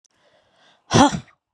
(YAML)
exhalation_length: 1.5 s
exhalation_amplitude: 31325
exhalation_signal_mean_std_ratio: 0.29
survey_phase: beta (2021-08-13 to 2022-03-07)
age: 45-64
gender: Female
wearing_mask: 'Yes'
symptom_cough_any: true
symptom_runny_or_blocked_nose: true
symptom_sore_throat: true
symptom_fatigue: true
symptom_fever_high_temperature: true
symptom_headache: true
smoker_status: Never smoked
respiratory_condition_asthma: false
respiratory_condition_other: false
recruitment_source: Test and Trace
submission_delay: 2 days
covid_test_result: Positive
covid_test_method: RT-qPCR
covid_ct_value: 19.4
covid_ct_gene: ORF1ab gene
covid_ct_mean: 19.7
covid_viral_load: 360000 copies/ml
covid_viral_load_category: Low viral load (10K-1M copies/ml)